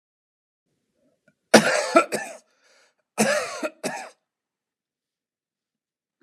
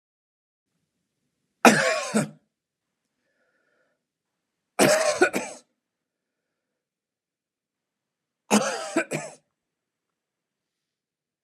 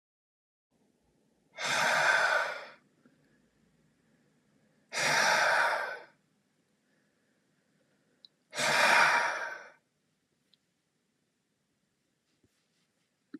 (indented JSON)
{
  "cough_length": "6.2 s",
  "cough_amplitude": 31953,
  "cough_signal_mean_std_ratio": 0.28,
  "three_cough_length": "11.4 s",
  "three_cough_amplitude": 32736,
  "three_cough_signal_mean_std_ratio": 0.27,
  "exhalation_length": "13.4 s",
  "exhalation_amplitude": 10664,
  "exhalation_signal_mean_std_ratio": 0.39,
  "survey_phase": "beta (2021-08-13 to 2022-03-07)",
  "age": "45-64",
  "gender": "Male",
  "wearing_mask": "No",
  "symptom_none": true,
  "smoker_status": "Never smoked",
  "respiratory_condition_asthma": true,
  "respiratory_condition_other": false,
  "recruitment_source": "REACT",
  "submission_delay": "1 day",
  "covid_test_result": "Negative",
  "covid_test_method": "RT-qPCR",
  "covid_ct_value": 41.0,
  "covid_ct_gene": "N gene",
  "influenza_a_test_result": "Unknown/Void",
  "influenza_b_test_result": "Unknown/Void"
}